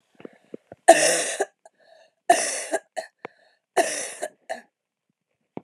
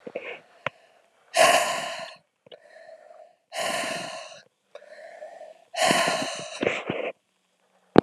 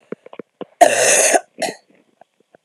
{"three_cough_length": "5.6 s", "three_cough_amplitude": 32768, "three_cough_signal_mean_std_ratio": 0.32, "exhalation_length": "8.0 s", "exhalation_amplitude": 32768, "exhalation_signal_mean_std_ratio": 0.4, "cough_length": "2.6 s", "cough_amplitude": 32768, "cough_signal_mean_std_ratio": 0.4, "survey_phase": "beta (2021-08-13 to 2022-03-07)", "age": "18-44", "gender": "Female", "wearing_mask": "No", "symptom_cough_any": true, "symptom_runny_or_blocked_nose": true, "symptom_sore_throat": true, "symptom_fatigue": true, "symptom_headache": true, "smoker_status": "Never smoked", "respiratory_condition_asthma": false, "respiratory_condition_other": false, "recruitment_source": "Test and Trace", "submission_delay": "2 days", "covid_test_result": "Positive", "covid_test_method": "RT-qPCR"}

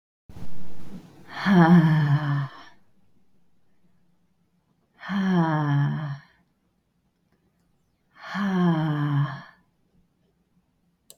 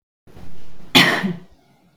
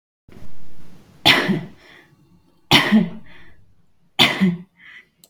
{"exhalation_length": "11.2 s", "exhalation_amplitude": 18368, "exhalation_signal_mean_std_ratio": 0.52, "cough_length": "2.0 s", "cough_amplitude": 32768, "cough_signal_mean_std_ratio": 0.55, "three_cough_length": "5.3 s", "three_cough_amplitude": 32768, "three_cough_signal_mean_std_ratio": 0.48, "survey_phase": "beta (2021-08-13 to 2022-03-07)", "age": "18-44", "gender": "Female", "wearing_mask": "No", "symptom_none": true, "smoker_status": "Never smoked", "respiratory_condition_asthma": false, "respiratory_condition_other": false, "recruitment_source": "REACT", "submission_delay": "2 days", "covid_test_result": "Negative", "covid_test_method": "RT-qPCR", "influenza_a_test_result": "Negative", "influenza_b_test_result": "Negative"}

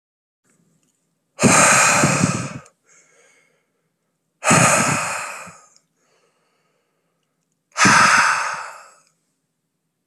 {"exhalation_length": "10.1 s", "exhalation_amplitude": 29293, "exhalation_signal_mean_std_ratio": 0.42, "survey_phase": "beta (2021-08-13 to 2022-03-07)", "age": "18-44", "gender": "Male", "wearing_mask": "No", "symptom_runny_or_blocked_nose": true, "smoker_status": "Current smoker (1 to 10 cigarettes per day)", "respiratory_condition_asthma": false, "respiratory_condition_other": false, "recruitment_source": "Test and Trace", "submission_delay": "1 day", "covid_test_result": "Positive", "covid_test_method": "RT-qPCR", "covid_ct_value": 25.5, "covid_ct_gene": "ORF1ab gene", "covid_ct_mean": 26.4, "covid_viral_load": "2200 copies/ml", "covid_viral_load_category": "Minimal viral load (< 10K copies/ml)"}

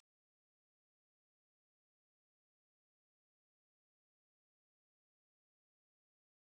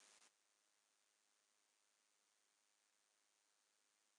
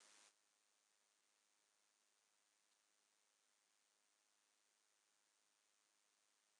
{"three_cough_length": "6.4 s", "three_cough_amplitude": 23, "three_cough_signal_mean_std_ratio": 0.02, "cough_length": "4.2 s", "cough_amplitude": 79, "cough_signal_mean_std_ratio": 0.63, "exhalation_length": "6.6 s", "exhalation_amplitude": 74, "exhalation_signal_mean_std_ratio": 0.65, "survey_phase": "beta (2021-08-13 to 2022-03-07)", "age": "45-64", "gender": "Female", "wearing_mask": "No", "symptom_none": true, "smoker_status": "Never smoked", "respiratory_condition_asthma": false, "respiratory_condition_other": false, "recruitment_source": "REACT", "submission_delay": "4 days", "covid_test_result": "Negative", "covid_test_method": "RT-qPCR", "influenza_a_test_result": "Negative", "influenza_b_test_result": "Negative"}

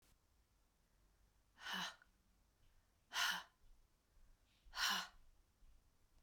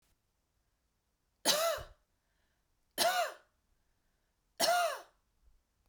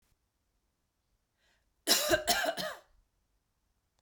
{"exhalation_length": "6.2 s", "exhalation_amplitude": 1786, "exhalation_signal_mean_std_ratio": 0.34, "three_cough_length": "5.9 s", "three_cough_amplitude": 6543, "three_cough_signal_mean_std_ratio": 0.36, "cough_length": "4.0 s", "cough_amplitude": 9423, "cough_signal_mean_std_ratio": 0.33, "survey_phase": "beta (2021-08-13 to 2022-03-07)", "age": "18-44", "gender": "Female", "wearing_mask": "No", "symptom_cough_any": true, "symptom_fatigue": true, "symptom_change_to_sense_of_smell_or_taste": true, "symptom_loss_of_taste": true, "smoker_status": "Ex-smoker", "respiratory_condition_asthma": false, "respiratory_condition_other": false, "recruitment_source": "Test and Trace", "submission_delay": "0 days", "covid_test_result": "Positive", "covid_test_method": "LFT"}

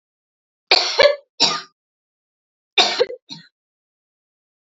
{"three_cough_length": "4.7 s", "three_cough_amplitude": 30447, "three_cough_signal_mean_std_ratio": 0.32, "survey_phase": "beta (2021-08-13 to 2022-03-07)", "age": "18-44", "gender": "Female", "wearing_mask": "No", "symptom_cough_any": true, "symptom_runny_or_blocked_nose": true, "symptom_shortness_of_breath": true, "symptom_fatigue": true, "symptom_headache": true, "symptom_change_to_sense_of_smell_or_taste": true, "symptom_onset": "6 days", "smoker_status": "Ex-smoker", "respiratory_condition_asthma": false, "respiratory_condition_other": false, "recruitment_source": "Test and Trace", "submission_delay": "2 days", "covid_test_result": "Positive", "covid_test_method": "RT-qPCR", "covid_ct_value": 19.0, "covid_ct_gene": "ORF1ab gene", "covid_ct_mean": 19.5, "covid_viral_load": "390000 copies/ml", "covid_viral_load_category": "Low viral load (10K-1M copies/ml)"}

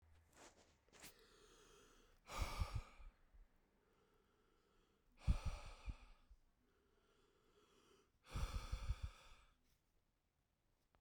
{"exhalation_length": "11.0 s", "exhalation_amplitude": 1431, "exhalation_signal_mean_std_ratio": 0.34, "survey_phase": "beta (2021-08-13 to 2022-03-07)", "age": "18-44", "gender": "Male", "wearing_mask": "No", "symptom_cough_any": true, "symptom_runny_or_blocked_nose": true, "symptom_abdominal_pain": true, "symptom_fatigue": true, "symptom_headache": true, "symptom_other": true, "smoker_status": "Ex-smoker", "respiratory_condition_asthma": false, "respiratory_condition_other": false, "recruitment_source": "Test and Trace", "submission_delay": "2 days", "covid_test_result": "Positive", "covid_test_method": "RT-qPCR", "covid_ct_value": 27.4, "covid_ct_gene": "N gene"}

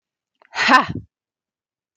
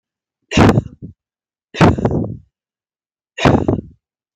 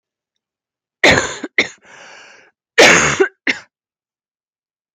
{"exhalation_length": "2.0 s", "exhalation_amplitude": 30981, "exhalation_signal_mean_std_ratio": 0.31, "three_cough_length": "4.4 s", "three_cough_amplitude": 31832, "three_cough_signal_mean_std_ratio": 0.39, "cough_length": "4.9 s", "cough_amplitude": 32767, "cough_signal_mean_std_ratio": 0.34, "survey_phase": "beta (2021-08-13 to 2022-03-07)", "age": "18-44", "gender": "Female", "wearing_mask": "No", "symptom_cough_any": true, "symptom_runny_or_blocked_nose": true, "symptom_fatigue": true, "symptom_headache": true, "symptom_onset": "6 days", "smoker_status": "Never smoked", "respiratory_condition_asthma": false, "respiratory_condition_other": false, "recruitment_source": "REACT", "submission_delay": "1 day", "covid_test_result": "Negative", "covid_test_method": "RT-qPCR"}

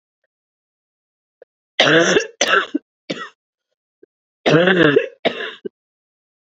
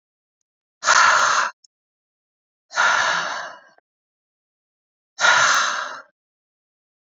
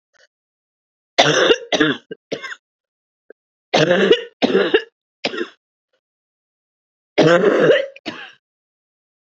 {"cough_length": "6.5 s", "cough_amplitude": 30111, "cough_signal_mean_std_ratio": 0.39, "exhalation_length": "7.1 s", "exhalation_amplitude": 28183, "exhalation_signal_mean_std_ratio": 0.43, "three_cough_length": "9.3 s", "three_cough_amplitude": 30150, "three_cough_signal_mean_std_ratio": 0.41, "survey_phase": "alpha (2021-03-01 to 2021-08-12)", "age": "45-64", "gender": "Female", "wearing_mask": "No", "symptom_cough_any": true, "symptom_fatigue": true, "symptom_fever_high_temperature": true, "symptom_change_to_sense_of_smell_or_taste": true, "symptom_loss_of_taste": true, "symptom_onset": "4 days", "smoker_status": "Never smoked", "respiratory_condition_asthma": false, "respiratory_condition_other": false, "recruitment_source": "Test and Trace", "submission_delay": "2 days", "covid_test_result": "Positive", "covid_test_method": "RT-qPCR"}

